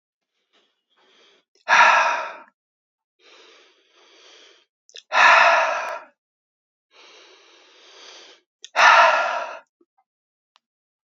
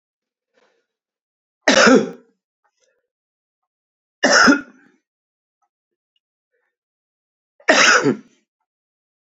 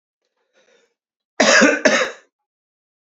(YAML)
exhalation_length: 11.1 s
exhalation_amplitude: 28169
exhalation_signal_mean_std_ratio: 0.34
three_cough_length: 9.4 s
three_cough_amplitude: 32767
three_cough_signal_mean_std_ratio: 0.29
cough_length: 3.1 s
cough_amplitude: 30091
cough_signal_mean_std_ratio: 0.36
survey_phase: beta (2021-08-13 to 2022-03-07)
age: 45-64
gender: Male
wearing_mask: 'No'
symptom_none: true
smoker_status: Ex-smoker
respiratory_condition_asthma: false
respiratory_condition_other: false
recruitment_source: REACT
submission_delay: 4 days
covid_test_result: Negative
covid_test_method: RT-qPCR
influenza_a_test_result: Negative
influenza_b_test_result: Negative